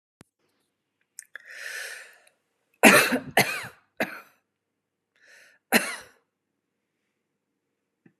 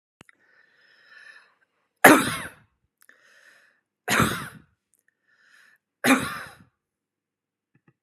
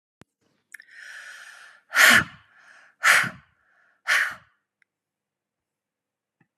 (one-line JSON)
{"cough_length": "8.2 s", "cough_amplitude": 32767, "cough_signal_mean_std_ratio": 0.24, "three_cough_length": "8.0 s", "three_cough_amplitude": 32768, "three_cough_signal_mean_std_ratio": 0.23, "exhalation_length": "6.6 s", "exhalation_amplitude": 28086, "exhalation_signal_mean_std_ratio": 0.28, "survey_phase": "beta (2021-08-13 to 2022-03-07)", "age": "65+", "gender": "Female", "wearing_mask": "No", "symptom_none": true, "smoker_status": "Never smoked", "respiratory_condition_asthma": false, "respiratory_condition_other": false, "recruitment_source": "REACT", "submission_delay": "1 day", "covid_test_result": "Negative", "covid_test_method": "RT-qPCR"}